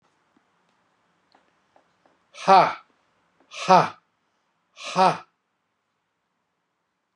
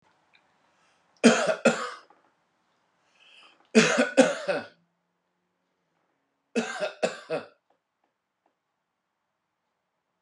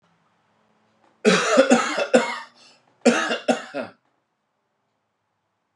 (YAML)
exhalation_length: 7.2 s
exhalation_amplitude: 24259
exhalation_signal_mean_std_ratio: 0.23
three_cough_length: 10.2 s
three_cough_amplitude: 22288
three_cough_signal_mean_std_ratio: 0.28
cough_length: 5.8 s
cough_amplitude: 28066
cough_signal_mean_std_ratio: 0.39
survey_phase: beta (2021-08-13 to 2022-03-07)
age: 45-64
gender: Male
wearing_mask: 'No'
symptom_none: true
smoker_status: Ex-smoker
respiratory_condition_asthma: false
respiratory_condition_other: false
recruitment_source: REACT
submission_delay: 1 day
covid_test_result: Negative
covid_test_method: RT-qPCR